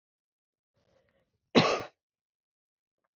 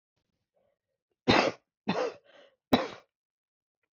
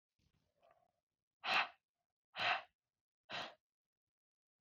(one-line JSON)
{"cough_length": "3.2 s", "cough_amplitude": 16770, "cough_signal_mean_std_ratio": 0.2, "three_cough_length": "3.9 s", "three_cough_amplitude": 12964, "three_cough_signal_mean_std_ratio": 0.29, "exhalation_length": "4.6 s", "exhalation_amplitude": 2610, "exhalation_signal_mean_std_ratio": 0.28, "survey_phase": "alpha (2021-03-01 to 2021-08-12)", "age": "18-44", "gender": "Female", "wearing_mask": "No", "symptom_cough_any": true, "symptom_shortness_of_breath": true, "symptom_fatigue": true, "symptom_fever_high_temperature": true, "symptom_onset": "2 days", "smoker_status": "Never smoked", "respiratory_condition_asthma": false, "respiratory_condition_other": false, "recruitment_source": "Test and Trace", "submission_delay": "1 day", "covid_test_result": "Positive", "covid_test_method": "RT-qPCR", "covid_ct_value": 20.5, "covid_ct_gene": "S gene", "covid_ct_mean": 20.6, "covid_viral_load": "170000 copies/ml", "covid_viral_load_category": "Low viral load (10K-1M copies/ml)"}